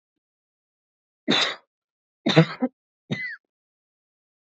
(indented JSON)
{
  "three_cough_length": "4.4 s",
  "three_cough_amplitude": 22669,
  "three_cough_signal_mean_std_ratio": 0.28,
  "survey_phase": "beta (2021-08-13 to 2022-03-07)",
  "age": "18-44",
  "gender": "Female",
  "wearing_mask": "No",
  "symptom_none": true,
  "symptom_onset": "10 days",
  "smoker_status": "Never smoked",
  "respiratory_condition_asthma": true,
  "respiratory_condition_other": false,
  "recruitment_source": "REACT",
  "submission_delay": "1 day",
  "covid_test_result": "Negative",
  "covid_test_method": "RT-qPCR",
  "influenza_a_test_result": "Negative",
  "influenza_b_test_result": "Negative"
}